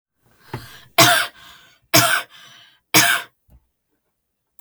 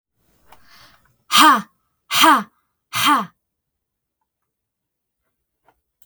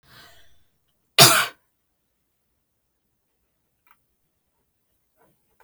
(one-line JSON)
{"three_cough_length": "4.6 s", "three_cough_amplitude": 32768, "three_cough_signal_mean_std_ratio": 0.35, "exhalation_length": "6.1 s", "exhalation_amplitude": 32768, "exhalation_signal_mean_std_ratio": 0.3, "cough_length": "5.6 s", "cough_amplitude": 32768, "cough_signal_mean_std_ratio": 0.17, "survey_phase": "beta (2021-08-13 to 2022-03-07)", "age": "18-44", "gender": "Female", "wearing_mask": "No", "symptom_none": true, "smoker_status": "Never smoked", "respiratory_condition_asthma": false, "respiratory_condition_other": false, "recruitment_source": "REACT", "submission_delay": "11 days", "covid_test_result": "Negative", "covid_test_method": "RT-qPCR", "influenza_a_test_result": "Negative", "influenza_b_test_result": "Negative"}